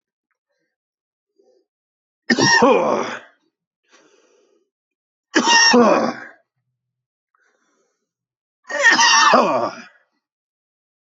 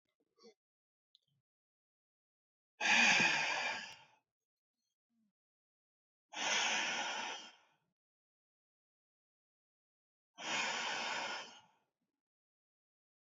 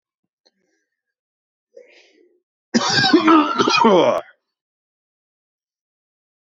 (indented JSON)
{
  "three_cough_length": "11.2 s",
  "three_cough_amplitude": 26001,
  "three_cough_signal_mean_std_ratio": 0.39,
  "exhalation_length": "13.2 s",
  "exhalation_amplitude": 4566,
  "exhalation_signal_mean_std_ratio": 0.36,
  "cough_length": "6.5 s",
  "cough_amplitude": 25453,
  "cough_signal_mean_std_ratio": 0.37,
  "survey_phase": "beta (2021-08-13 to 2022-03-07)",
  "age": "18-44",
  "gender": "Female",
  "wearing_mask": "No",
  "symptom_runny_or_blocked_nose": true,
  "symptom_sore_throat": true,
  "symptom_fever_high_temperature": true,
  "smoker_status": "Ex-smoker",
  "respiratory_condition_asthma": true,
  "respiratory_condition_other": false,
  "recruitment_source": "Test and Trace",
  "submission_delay": "1 day",
  "covid_test_result": "Negative"
}